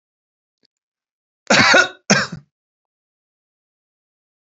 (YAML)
cough_length: 4.4 s
cough_amplitude: 31848
cough_signal_mean_std_ratio: 0.28
survey_phase: beta (2021-08-13 to 2022-03-07)
age: 65+
gender: Male
wearing_mask: 'No'
symptom_runny_or_blocked_nose: true
smoker_status: Never smoked
respiratory_condition_asthma: false
respiratory_condition_other: false
recruitment_source: REACT
submission_delay: 3 days
covid_test_result: Negative
covid_test_method: RT-qPCR
influenza_a_test_result: Negative
influenza_b_test_result: Negative